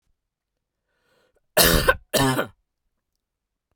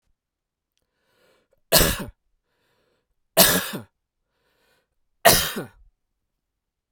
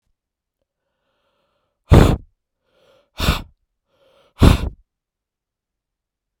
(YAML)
cough_length: 3.8 s
cough_amplitude: 30931
cough_signal_mean_std_ratio: 0.33
three_cough_length: 6.9 s
three_cough_amplitude: 32768
three_cough_signal_mean_std_ratio: 0.26
exhalation_length: 6.4 s
exhalation_amplitude: 32768
exhalation_signal_mean_std_ratio: 0.23
survey_phase: beta (2021-08-13 to 2022-03-07)
age: 45-64
gender: Male
wearing_mask: 'No'
symptom_none: true
smoker_status: Never smoked
respiratory_condition_asthma: false
respiratory_condition_other: false
recruitment_source: REACT
submission_delay: 2 days
covid_test_result: Negative
covid_test_method: RT-qPCR
influenza_a_test_result: Negative
influenza_b_test_result: Negative